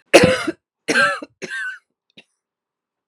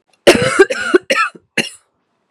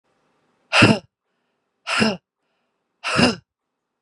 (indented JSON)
{
  "three_cough_length": "3.1 s",
  "three_cough_amplitude": 32768,
  "three_cough_signal_mean_std_ratio": 0.36,
  "cough_length": "2.3 s",
  "cough_amplitude": 32768,
  "cough_signal_mean_std_ratio": 0.45,
  "exhalation_length": "4.0 s",
  "exhalation_amplitude": 32688,
  "exhalation_signal_mean_std_ratio": 0.33,
  "survey_phase": "beta (2021-08-13 to 2022-03-07)",
  "age": "45-64",
  "gender": "Female",
  "wearing_mask": "No",
  "symptom_new_continuous_cough": true,
  "symptom_runny_or_blocked_nose": true,
  "symptom_shortness_of_breath": true,
  "symptom_sore_throat": true,
  "symptom_fatigue": true,
  "symptom_fever_high_temperature": true,
  "symptom_headache": true,
  "symptom_other": true,
  "symptom_onset": "2 days",
  "smoker_status": "Never smoked",
  "respiratory_condition_asthma": true,
  "respiratory_condition_other": false,
  "recruitment_source": "Test and Trace",
  "submission_delay": "1 day",
  "covid_test_result": "Positive",
  "covid_test_method": "RT-qPCR",
  "covid_ct_value": 24.5,
  "covid_ct_gene": "N gene",
  "covid_ct_mean": 24.8,
  "covid_viral_load": "7300 copies/ml",
  "covid_viral_load_category": "Minimal viral load (< 10K copies/ml)"
}